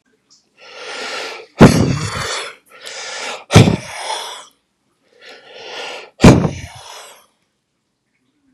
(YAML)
exhalation_length: 8.5 s
exhalation_amplitude: 32768
exhalation_signal_mean_std_ratio: 0.34
survey_phase: beta (2021-08-13 to 2022-03-07)
age: 45-64
gender: Male
wearing_mask: 'Yes'
symptom_shortness_of_breath: true
symptom_fatigue: true
smoker_status: Ex-smoker
respiratory_condition_asthma: false
respiratory_condition_other: false
recruitment_source: REACT
submission_delay: 20 days
covid_test_result: Negative
covid_test_method: RT-qPCR
influenza_a_test_result: Negative
influenza_b_test_result: Negative